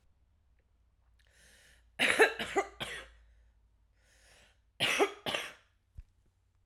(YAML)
cough_length: 6.7 s
cough_amplitude: 9664
cough_signal_mean_std_ratio: 0.31
survey_phase: alpha (2021-03-01 to 2021-08-12)
age: 45-64
gender: Female
wearing_mask: 'No'
symptom_none: true
smoker_status: Current smoker (11 or more cigarettes per day)
respiratory_condition_asthma: false
respiratory_condition_other: false
recruitment_source: REACT
submission_delay: 1 day
covid_test_result: Negative
covid_test_method: RT-qPCR